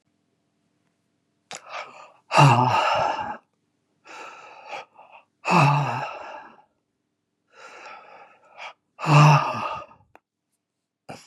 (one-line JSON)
{"exhalation_length": "11.3 s", "exhalation_amplitude": 27436, "exhalation_signal_mean_std_ratio": 0.37, "survey_phase": "beta (2021-08-13 to 2022-03-07)", "age": "65+", "gender": "Male", "wearing_mask": "No", "symptom_cough_any": true, "symptom_runny_or_blocked_nose": true, "symptom_fatigue": true, "symptom_headache": true, "symptom_change_to_sense_of_smell_or_taste": true, "symptom_onset": "8 days", "smoker_status": "Ex-smoker", "respiratory_condition_asthma": false, "respiratory_condition_other": false, "recruitment_source": "Test and Trace", "submission_delay": "2 days", "covid_test_result": "Positive", "covid_test_method": "RT-qPCR", "covid_ct_value": 17.8, "covid_ct_gene": "ORF1ab gene", "covid_ct_mean": 19.0, "covid_viral_load": "600000 copies/ml", "covid_viral_load_category": "Low viral load (10K-1M copies/ml)"}